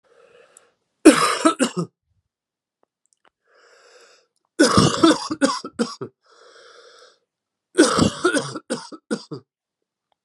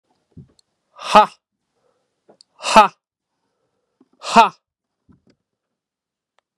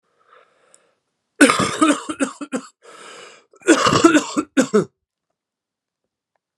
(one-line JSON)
{"three_cough_length": "10.2 s", "three_cough_amplitude": 32768, "three_cough_signal_mean_std_ratio": 0.35, "exhalation_length": "6.6 s", "exhalation_amplitude": 32768, "exhalation_signal_mean_std_ratio": 0.21, "cough_length": "6.6 s", "cough_amplitude": 32767, "cough_signal_mean_std_ratio": 0.37, "survey_phase": "beta (2021-08-13 to 2022-03-07)", "age": "45-64", "gender": "Male", "wearing_mask": "No", "symptom_cough_any": true, "symptom_runny_or_blocked_nose": true, "symptom_fatigue": true, "symptom_fever_high_temperature": true, "symptom_onset": "3 days", "smoker_status": "Never smoked", "respiratory_condition_asthma": true, "respiratory_condition_other": false, "recruitment_source": "Test and Trace", "submission_delay": "2 days", "covid_test_result": "Positive", "covid_test_method": "RT-qPCR", "covid_ct_value": 15.9, "covid_ct_gene": "ORF1ab gene", "covid_ct_mean": 16.3, "covid_viral_load": "4500000 copies/ml", "covid_viral_load_category": "High viral load (>1M copies/ml)"}